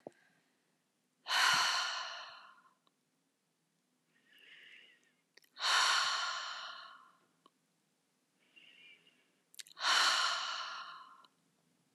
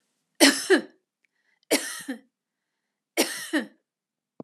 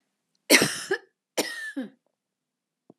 {"exhalation_length": "11.9 s", "exhalation_amplitude": 5442, "exhalation_signal_mean_std_ratio": 0.41, "three_cough_length": "4.4 s", "three_cough_amplitude": 31475, "three_cough_signal_mean_std_ratio": 0.31, "cough_length": "3.0 s", "cough_amplitude": 31335, "cough_signal_mean_std_ratio": 0.31, "survey_phase": "beta (2021-08-13 to 2022-03-07)", "age": "45-64", "gender": "Female", "wearing_mask": "No", "symptom_none": true, "smoker_status": "Ex-smoker", "respiratory_condition_asthma": false, "respiratory_condition_other": false, "recruitment_source": "REACT", "submission_delay": "3 days", "covid_test_result": "Negative", "covid_test_method": "RT-qPCR", "influenza_a_test_result": "Negative", "influenza_b_test_result": "Negative"}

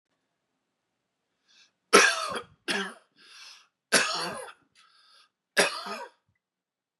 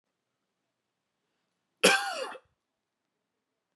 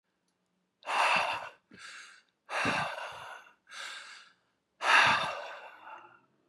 {"three_cough_length": "7.0 s", "three_cough_amplitude": 25698, "three_cough_signal_mean_std_ratio": 0.3, "cough_length": "3.8 s", "cough_amplitude": 15043, "cough_signal_mean_std_ratio": 0.22, "exhalation_length": "6.5 s", "exhalation_amplitude": 9452, "exhalation_signal_mean_std_ratio": 0.44, "survey_phase": "beta (2021-08-13 to 2022-03-07)", "age": "18-44", "gender": "Male", "wearing_mask": "No", "symptom_none": true, "smoker_status": "Never smoked", "respiratory_condition_asthma": false, "respiratory_condition_other": false, "recruitment_source": "REACT", "submission_delay": "0 days", "covid_test_result": "Negative", "covid_test_method": "RT-qPCR", "influenza_a_test_result": "Negative", "influenza_b_test_result": "Negative"}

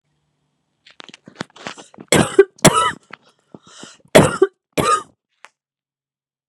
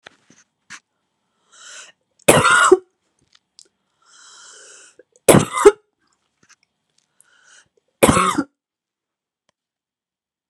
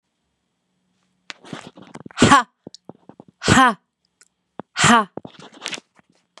{"cough_length": "6.5 s", "cough_amplitude": 32768, "cough_signal_mean_std_ratio": 0.29, "three_cough_length": "10.5 s", "three_cough_amplitude": 32768, "three_cough_signal_mean_std_ratio": 0.25, "exhalation_length": "6.4 s", "exhalation_amplitude": 32767, "exhalation_signal_mean_std_ratio": 0.29, "survey_phase": "beta (2021-08-13 to 2022-03-07)", "age": "45-64", "gender": "Female", "wearing_mask": "No", "symptom_cough_any": true, "symptom_new_continuous_cough": true, "symptom_runny_or_blocked_nose": true, "symptom_sore_throat": true, "symptom_diarrhoea": true, "symptom_fatigue": true, "symptom_headache": true, "symptom_change_to_sense_of_smell_or_taste": true, "symptom_loss_of_taste": true, "smoker_status": "Never smoked", "respiratory_condition_asthma": false, "respiratory_condition_other": false, "recruitment_source": "Test and Trace", "submission_delay": "2 days", "covid_test_result": "Positive", "covid_test_method": "RT-qPCR", "covid_ct_value": 16.1, "covid_ct_gene": "ORF1ab gene", "covid_ct_mean": 17.1, "covid_viral_load": "2500000 copies/ml", "covid_viral_load_category": "High viral load (>1M copies/ml)"}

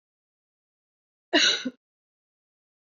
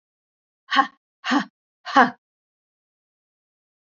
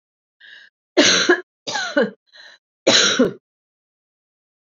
{"cough_length": "3.0 s", "cough_amplitude": 12481, "cough_signal_mean_std_ratio": 0.25, "exhalation_length": "3.9 s", "exhalation_amplitude": 27264, "exhalation_signal_mean_std_ratio": 0.25, "three_cough_length": "4.6 s", "three_cough_amplitude": 30754, "three_cough_signal_mean_std_ratio": 0.4, "survey_phase": "beta (2021-08-13 to 2022-03-07)", "age": "45-64", "gender": "Female", "wearing_mask": "No", "symptom_fatigue": true, "symptom_other": true, "symptom_onset": "3 days", "smoker_status": "Never smoked", "respiratory_condition_asthma": false, "respiratory_condition_other": false, "recruitment_source": "REACT", "submission_delay": "0 days", "covid_test_result": "Negative", "covid_test_method": "RT-qPCR", "influenza_a_test_result": "Negative", "influenza_b_test_result": "Negative"}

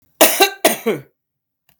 {"cough_length": "1.8 s", "cough_amplitude": 32768, "cough_signal_mean_std_ratio": 0.4, "survey_phase": "beta (2021-08-13 to 2022-03-07)", "age": "45-64", "gender": "Female", "wearing_mask": "No", "symptom_sore_throat": true, "symptom_abdominal_pain": true, "symptom_fatigue": true, "symptom_headache": true, "symptom_change_to_sense_of_smell_or_taste": true, "symptom_onset": "2 days", "smoker_status": "Ex-smoker", "respiratory_condition_asthma": false, "respiratory_condition_other": false, "recruitment_source": "Test and Trace", "submission_delay": "1 day", "covid_test_result": "Positive", "covid_test_method": "RT-qPCR", "covid_ct_value": 18.3, "covid_ct_gene": "ORF1ab gene", "covid_ct_mean": 18.9, "covid_viral_load": "650000 copies/ml", "covid_viral_load_category": "Low viral load (10K-1M copies/ml)"}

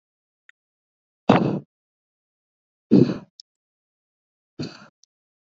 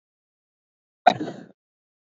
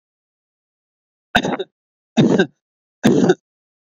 {"exhalation_length": "5.5 s", "exhalation_amplitude": 31005, "exhalation_signal_mean_std_ratio": 0.22, "cough_length": "2.0 s", "cough_amplitude": 27685, "cough_signal_mean_std_ratio": 0.17, "three_cough_length": "3.9 s", "three_cough_amplitude": 30459, "three_cough_signal_mean_std_ratio": 0.35, "survey_phase": "beta (2021-08-13 to 2022-03-07)", "age": "18-44", "gender": "Male", "wearing_mask": "No", "symptom_none": true, "smoker_status": "Never smoked", "respiratory_condition_asthma": false, "respiratory_condition_other": false, "recruitment_source": "REACT", "submission_delay": "2 days", "covid_test_result": "Negative", "covid_test_method": "RT-qPCR"}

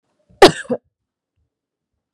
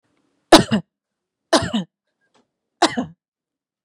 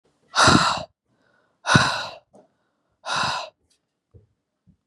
{"cough_length": "2.1 s", "cough_amplitude": 32768, "cough_signal_mean_std_ratio": 0.19, "three_cough_length": "3.8 s", "three_cough_amplitude": 32768, "three_cough_signal_mean_std_ratio": 0.26, "exhalation_length": "4.9 s", "exhalation_amplitude": 30660, "exhalation_signal_mean_std_ratio": 0.36, "survey_phase": "beta (2021-08-13 to 2022-03-07)", "age": "18-44", "gender": "Female", "wearing_mask": "No", "symptom_cough_any": true, "symptom_onset": "4 days", "smoker_status": "Never smoked", "respiratory_condition_asthma": false, "respiratory_condition_other": false, "recruitment_source": "Test and Trace", "submission_delay": "2 days", "covid_test_result": "Positive", "covid_test_method": "RT-qPCR", "covid_ct_value": 23.3, "covid_ct_gene": "ORF1ab gene", "covid_ct_mean": 23.8, "covid_viral_load": "15000 copies/ml", "covid_viral_load_category": "Low viral load (10K-1M copies/ml)"}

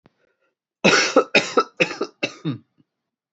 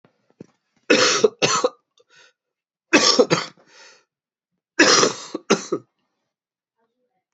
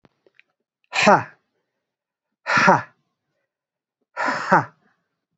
{"cough_length": "3.3 s", "cough_amplitude": 28310, "cough_signal_mean_std_ratio": 0.38, "three_cough_length": "7.3 s", "three_cough_amplitude": 29857, "three_cough_signal_mean_std_ratio": 0.36, "exhalation_length": "5.4 s", "exhalation_amplitude": 32768, "exhalation_signal_mean_std_ratio": 0.31, "survey_phase": "beta (2021-08-13 to 2022-03-07)", "age": "18-44", "gender": "Male", "wearing_mask": "No", "symptom_cough_any": true, "symptom_runny_or_blocked_nose": true, "symptom_fatigue": true, "symptom_headache": true, "smoker_status": "Never smoked", "respiratory_condition_asthma": false, "respiratory_condition_other": false, "recruitment_source": "Test and Trace", "submission_delay": "1 day", "covid_test_result": "Negative", "covid_test_method": "LFT"}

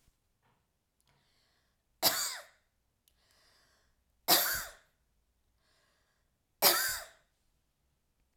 {"three_cough_length": "8.4 s", "three_cough_amplitude": 11211, "three_cough_signal_mean_std_ratio": 0.26, "survey_phase": "alpha (2021-03-01 to 2021-08-12)", "age": "45-64", "gender": "Female", "wearing_mask": "No", "symptom_none": true, "smoker_status": "Never smoked", "respiratory_condition_asthma": false, "respiratory_condition_other": false, "recruitment_source": "REACT", "submission_delay": "1 day", "covid_test_result": "Negative", "covid_test_method": "RT-qPCR"}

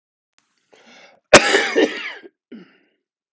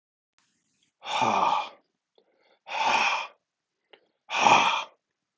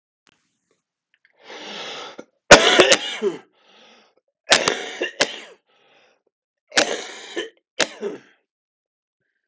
{"cough_length": "3.3 s", "cough_amplitude": 32768, "cough_signal_mean_std_ratio": 0.3, "exhalation_length": "5.4 s", "exhalation_amplitude": 19976, "exhalation_signal_mean_std_ratio": 0.44, "three_cough_length": "9.5 s", "three_cough_amplitude": 32768, "three_cough_signal_mean_std_ratio": 0.28, "survey_phase": "beta (2021-08-13 to 2022-03-07)", "age": "45-64", "gender": "Male", "wearing_mask": "No", "symptom_cough_any": true, "symptom_new_continuous_cough": true, "symptom_runny_or_blocked_nose": true, "symptom_shortness_of_breath": true, "symptom_sore_throat": true, "symptom_diarrhoea": true, "symptom_fatigue": true, "symptom_fever_high_temperature": true, "symptom_headache": true, "symptom_change_to_sense_of_smell_or_taste": true, "symptom_loss_of_taste": true, "symptom_onset": "4 days", "smoker_status": "Ex-smoker", "respiratory_condition_asthma": false, "respiratory_condition_other": false, "recruitment_source": "Test and Trace", "submission_delay": "2 days", "covid_test_result": "Positive", "covid_test_method": "RT-qPCR", "covid_ct_value": 19.9, "covid_ct_gene": "ORF1ab gene"}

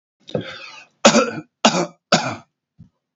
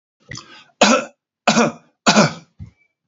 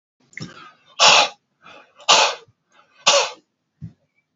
{"cough_length": "3.2 s", "cough_amplitude": 32767, "cough_signal_mean_std_ratio": 0.37, "three_cough_length": "3.1 s", "three_cough_amplitude": 32768, "three_cough_signal_mean_std_ratio": 0.39, "exhalation_length": "4.4 s", "exhalation_amplitude": 32109, "exhalation_signal_mean_std_ratio": 0.35, "survey_phase": "alpha (2021-03-01 to 2021-08-12)", "age": "65+", "gender": "Male", "wearing_mask": "No", "symptom_none": true, "smoker_status": "Ex-smoker", "respiratory_condition_asthma": false, "respiratory_condition_other": false, "recruitment_source": "REACT", "submission_delay": "2 days", "covid_test_result": "Negative", "covid_test_method": "RT-qPCR"}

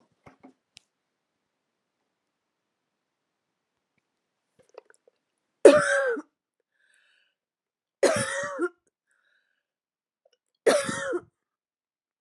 {"three_cough_length": "12.2 s", "three_cough_amplitude": 30960, "three_cough_signal_mean_std_ratio": 0.23, "survey_phase": "beta (2021-08-13 to 2022-03-07)", "age": "45-64", "gender": "Female", "wearing_mask": "No", "symptom_none": true, "smoker_status": "Never smoked", "respiratory_condition_asthma": false, "respiratory_condition_other": false, "recruitment_source": "REACT", "submission_delay": "1 day", "covid_test_result": "Negative", "covid_test_method": "RT-qPCR", "influenza_a_test_result": "Negative", "influenza_b_test_result": "Negative"}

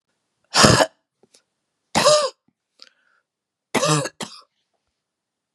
{"three_cough_length": "5.5 s", "three_cough_amplitude": 32768, "three_cough_signal_mean_std_ratio": 0.32, "survey_phase": "beta (2021-08-13 to 2022-03-07)", "age": "45-64", "gender": "Female", "wearing_mask": "No", "symptom_cough_any": true, "symptom_runny_or_blocked_nose": true, "symptom_sore_throat": true, "symptom_abdominal_pain": true, "symptom_fatigue": true, "symptom_headache": true, "smoker_status": "Never smoked", "respiratory_condition_asthma": false, "respiratory_condition_other": false, "recruitment_source": "Test and Trace", "submission_delay": "2 days", "covid_test_result": "Positive", "covid_test_method": "RT-qPCR", "covid_ct_value": 28.6, "covid_ct_gene": "ORF1ab gene"}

